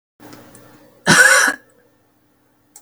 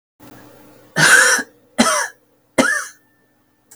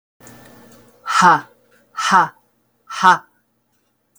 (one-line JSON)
{"cough_length": "2.8 s", "cough_amplitude": 32768, "cough_signal_mean_std_ratio": 0.35, "three_cough_length": "3.8 s", "three_cough_amplitude": 32768, "three_cough_signal_mean_std_ratio": 0.42, "exhalation_length": "4.2 s", "exhalation_amplitude": 32766, "exhalation_signal_mean_std_ratio": 0.34, "survey_phase": "beta (2021-08-13 to 2022-03-07)", "age": "45-64", "gender": "Female", "wearing_mask": "No", "symptom_none": true, "smoker_status": "Never smoked", "respiratory_condition_asthma": false, "respiratory_condition_other": false, "recruitment_source": "REACT", "submission_delay": "2 days", "covid_test_result": "Negative", "covid_test_method": "RT-qPCR", "influenza_a_test_result": "Negative", "influenza_b_test_result": "Negative"}